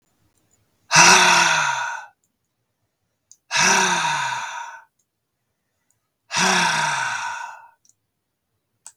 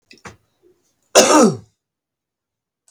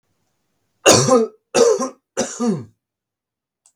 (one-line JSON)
{"exhalation_length": "9.0 s", "exhalation_amplitude": 32768, "exhalation_signal_mean_std_ratio": 0.46, "cough_length": "2.9 s", "cough_amplitude": 32768, "cough_signal_mean_std_ratio": 0.3, "three_cough_length": "3.8 s", "three_cough_amplitude": 32768, "three_cough_signal_mean_std_ratio": 0.42, "survey_phase": "beta (2021-08-13 to 2022-03-07)", "age": "18-44", "gender": "Male", "wearing_mask": "No", "symptom_none": true, "smoker_status": "Never smoked", "respiratory_condition_asthma": false, "respiratory_condition_other": false, "recruitment_source": "REACT", "submission_delay": "0 days", "covid_test_result": "Negative", "covid_test_method": "RT-qPCR", "influenza_a_test_result": "Unknown/Void", "influenza_b_test_result": "Unknown/Void"}